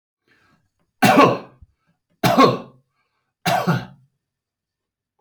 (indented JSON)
{
  "three_cough_length": "5.2 s",
  "three_cough_amplitude": 28788,
  "three_cough_signal_mean_std_ratio": 0.35,
  "survey_phase": "alpha (2021-03-01 to 2021-08-12)",
  "age": "45-64",
  "gender": "Male",
  "wearing_mask": "No",
  "symptom_none": true,
  "smoker_status": "Never smoked",
  "respiratory_condition_asthma": false,
  "respiratory_condition_other": false,
  "recruitment_source": "REACT",
  "submission_delay": "1 day",
  "covid_test_result": "Negative",
  "covid_test_method": "RT-qPCR"
}